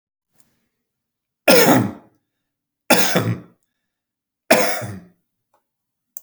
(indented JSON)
{
  "three_cough_length": "6.2 s",
  "three_cough_amplitude": 32768,
  "three_cough_signal_mean_std_ratio": 0.34,
  "survey_phase": "beta (2021-08-13 to 2022-03-07)",
  "age": "45-64",
  "gender": "Male",
  "wearing_mask": "No",
  "symptom_none": true,
  "smoker_status": "Never smoked",
  "respiratory_condition_asthma": false,
  "respiratory_condition_other": false,
  "recruitment_source": "REACT",
  "submission_delay": "10 days",
  "covid_test_result": "Negative",
  "covid_test_method": "RT-qPCR",
  "influenza_a_test_result": "Negative",
  "influenza_b_test_result": "Negative"
}